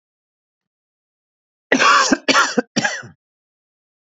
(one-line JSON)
{"cough_length": "4.0 s", "cough_amplitude": 31896, "cough_signal_mean_std_ratio": 0.37, "survey_phase": "beta (2021-08-13 to 2022-03-07)", "age": "45-64", "gender": "Male", "wearing_mask": "No", "symptom_none": true, "smoker_status": "Never smoked", "respiratory_condition_asthma": false, "respiratory_condition_other": false, "recruitment_source": "REACT", "submission_delay": "2 days", "covid_test_result": "Negative", "covid_test_method": "RT-qPCR", "influenza_a_test_result": "Negative", "influenza_b_test_result": "Negative"}